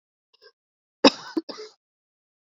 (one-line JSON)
{"cough_length": "2.6 s", "cough_amplitude": 27988, "cough_signal_mean_std_ratio": 0.17, "survey_phase": "beta (2021-08-13 to 2022-03-07)", "age": "45-64", "gender": "Female", "wearing_mask": "No", "symptom_cough_any": true, "symptom_runny_or_blocked_nose": true, "symptom_sore_throat": true, "symptom_diarrhoea": true, "symptom_fatigue": true, "symptom_headache": true, "smoker_status": "Ex-smoker", "respiratory_condition_asthma": false, "respiratory_condition_other": false, "recruitment_source": "Test and Trace", "submission_delay": "2 days", "covid_test_result": "Positive", "covid_test_method": "ePCR"}